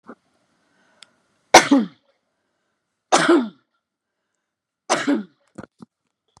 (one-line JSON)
{"three_cough_length": "6.4 s", "three_cough_amplitude": 32768, "three_cough_signal_mean_std_ratio": 0.27, "survey_phase": "beta (2021-08-13 to 2022-03-07)", "age": "45-64", "gender": "Female", "wearing_mask": "No", "symptom_none": true, "smoker_status": "Never smoked", "respiratory_condition_asthma": false, "respiratory_condition_other": false, "recruitment_source": "REACT", "submission_delay": "18 days", "covid_test_result": "Negative", "covid_test_method": "RT-qPCR"}